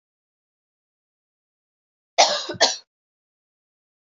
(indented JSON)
{
  "three_cough_length": "4.2 s",
  "three_cough_amplitude": 26933,
  "three_cough_signal_mean_std_ratio": 0.22,
  "survey_phase": "beta (2021-08-13 to 2022-03-07)",
  "age": "18-44",
  "gender": "Female",
  "wearing_mask": "No",
  "symptom_new_continuous_cough": true,
  "symptom_runny_or_blocked_nose": true,
  "symptom_sore_throat": true,
  "symptom_fatigue": true,
  "symptom_fever_high_temperature": true,
  "symptom_headache": true,
  "symptom_change_to_sense_of_smell_or_taste": true,
  "symptom_onset": "3 days",
  "smoker_status": "Never smoked",
  "respiratory_condition_asthma": false,
  "respiratory_condition_other": false,
  "recruitment_source": "Test and Trace",
  "submission_delay": "1 day",
  "covid_test_result": "Positive",
  "covid_test_method": "RT-qPCR",
  "covid_ct_value": 11.8,
  "covid_ct_gene": "ORF1ab gene",
  "covid_ct_mean": 12.3,
  "covid_viral_load": "95000000 copies/ml",
  "covid_viral_load_category": "High viral load (>1M copies/ml)"
}